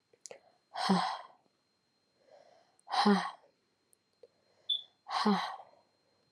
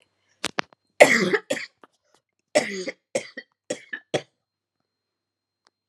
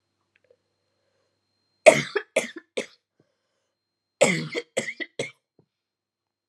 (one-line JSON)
{"exhalation_length": "6.3 s", "exhalation_amplitude": 6670, "exhalation_signal_mean_std_ratio": 0.36, "cough_length": "5.9 s", "cough_amplitude": 32767, "cough_signal_mean_std_ratio": 0.26, "three_cough_length": "6.5 s", "three_cough_amplitude": 32767, "three_cough_signal_mean_std_ratio": 0.22, "survey_phase": "beta (2021-08-13 to 2022-03-07)", "age": "18-44", "gender": "Female", "wearing_mask": "No", "symptom_cough_any": true, "symptom_runny_or_blocked_nose": true, "symptom_sore_throat": true, "symptom_fatigue": true, "symptom_headache": true, "smoker_status": "Never smoked", "respiratory_condition_asthma": false, "respiratory_condition_other": false, "recruitment_source": "Test and Trace", "submission_delay": "2 days", "covid_test_result": "Positive", "covid_test_method": "RT-qPCR", "covid_ct_value": 17.8, "covid_ct_gene": "ORF1ab gene", "covid_ct_mean": 18.0, "covid_viral_load": "1200000 copies/ml", "covid_viral_load_category": "High viral load (>1M copies/ml)"}